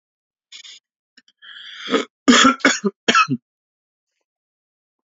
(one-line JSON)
{"three_cough_length": "5.0 s", "three_cough_amplitude": 28460, "three_cough_signal_mean_std_ratio": 0.33, "survey_phase": "beta (2021-08-13 to 2022-03-07)", "age": "45-64", "gender": "Male", "wearing_mask": "No", "symptom_none": true, "symptom_onset": "5 days", "smoker_status": "Never smoked", "respiratory_condition_asthma": false, "respiratory_condition_other": false, "recruitment_source": "Test and Trace", "submission_delay": "1 day", "covid_test_result": "Positive", "covid_test_method": "RT-qPCR", "covid_ct_value": 17.4, "covid_ct_gene": "ORF1ab gene", "covid_ct_mean": 17.6, "covid_viral_load": "1700000 copies/ml", "covid_viral_load_category": "High viral load (>1M copies/ml)"}